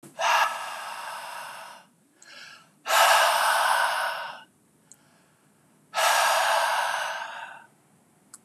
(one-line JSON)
{"exhalation_length": "8.4 s", "exhalation_amplitude": 16174, "exhalation_signal_mean_std_ratio": 0.57, "survey_phase": "beta (2021-08-13 to 2022-03-07)", "age": "45-64", "gender": "Male", "wearing_mask": "No", "symptom_none": true, "smoker_status": "Never smoked", "respiratory_condition_asthma": false, "respiratory_condition_other": false, "recruitment_source": "REACT", "submission_delay": "1 day", "covid_test_result": "Negative", "covid_test_method": "RT-qPCR", "covid_ct_value": 37.6, "covid_ct_gene": "N gene", "influenza_a_test_result": "Negative", "influenza_b_test_result": "Negative"}